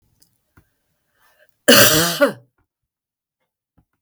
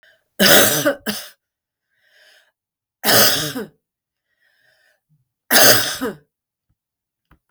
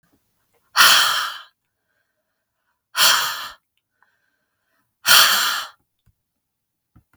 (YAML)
cough_length: 4.0 s
cough_amplitude: 32768
cough_signal_mean_std_ratio: 0.29
three_cough_length: 7.5 s
three_cough_amplitude: 32768
three_cough_signal_mean_std_ratio: 0.36
exhalation_length: 7.2 s
exhalation_amplitude: 32768
exhalation_signal_mean_std_ratio: 0.35
survey_phase: beta (2021-08-13 to 2022-03-07)
age: 45-64
gender: Female
wearing_mask: 'No'
symptom_none: true
smoker_status: Ex-smoker
respiratory_condition_asthma: false
respiratory_condition_other: false
recruitment_source: REACT
submission_delay: 2 days
covid_test_result: Negative
covid_test_method: RT-qPCR
influenza_a_test_result: Negative
influenza_b_test_result: Negative